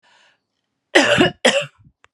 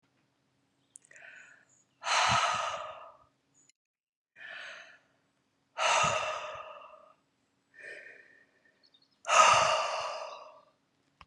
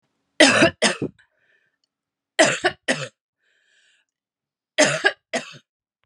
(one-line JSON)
{"cough_length": "2.1 s", "cough_amplitude": 32768, "cough_signal_mean_std_ratio": 0.4, "exhalation_length": "11.3 s", "exhalation_amplitude": 11956, "exhalation_signal_mean_std_ratio": 0.38, "three_cough_length": "6.1 s", "three_cough_amplitude": 32334, "three_cough_signal_mean_std_ratio": 0.33, "survey_phase": "beta (2021-08-13 to 2022-03-07)", "age": "45-64", "gender": "Female", "wearing_mask": "No", "symptom_new_continuous_cough": true, "symptom_runny_or_blocked_nose": true, "symptom_fatigue": true, "symptom_fever_high_temperature": true, "symptom_headache": true, "symptom_change_to_sense_of_smell_or_taste": true, "symptom_loss_of_taste": true, "symptom_onset": "3 days", "smoker_status": "Prefer not to say", "respiratory_condition_asthma": false, "respiratory_condition_other": false, "recruitment_source": "Test and Trace", "submission_delay": "2 days", "covid_test_result": "Positive", "covid_test_method": "RT-qPCR", "covid_ct_value": 16.2, "covid_ct_gene": "ORF1ab gene", "covid_ct_mean": 17.2, "covid_viral_load": "2300000 copies/ml", "covid_viral_load_category": "High viral load (>1M copies/ml)"}